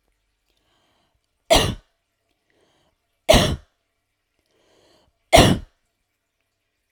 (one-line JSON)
{"three_cough_length": "6.9 s", "three_cough_amplitude": 32768, "three_cough_signal_mean_std_ratio": 0.24, "survey_phase": "alpha (2021-03-01 to 2021-08-12)", "age": "45-64", "gender": "Female", "wearing_mask": "No", "symptom_none": true, "smoker_status": "Never smoked", "respiratory_condition_asthma": false, "respiratory_condition_other": false, "recruitment_source": "REACT", "submission_delay": "1 day", "covid_test_result": "Negative", "covid_test_method": "RT-qPCR"}